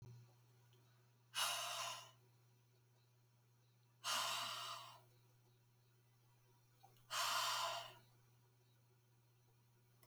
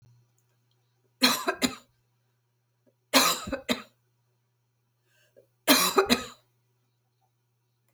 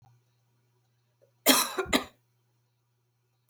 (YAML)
exhalation_length: 10.1 s
exhalation_amplitude: 1459
exhalation_signal_mean_std_ratio: 0.45
three_cough_length: 7.9 s
three_cough_amplitude: 18448
three_cough_signal_mean_std_ratio: 0.3
cough_length: 3.5 s
cough_amplitude: 20500
cough_signal_mean_std_ratio: 0.26
survey_phase: beta (2021-08-13 to 2022-03-07)
age: 45-64
gender: Female
wearing_mask: 'No'
symptom_cough_any: true
symptom_runny_or_blocked_nose: true
symptom_sore_throat: true
symptom_fever_high_temperature: true
symptom_onset: 4 days
smoker_status: Never smoked
respiratory_condition_asthma: false
respiratory_condition_other: false
recruitment_source: Test and Trace
submission_delay: 1 day
covid_test_result: Positive
covid_test_method: RT-qPCR
covid_ct_value: 24.2
covid_ct_gene: ORF1ab gene
covid_ct_mean: 25.3
covid_viral_load: 4900 copies/ml
covid_viral_load_category: Minimal viral load (< 10K copies/ml)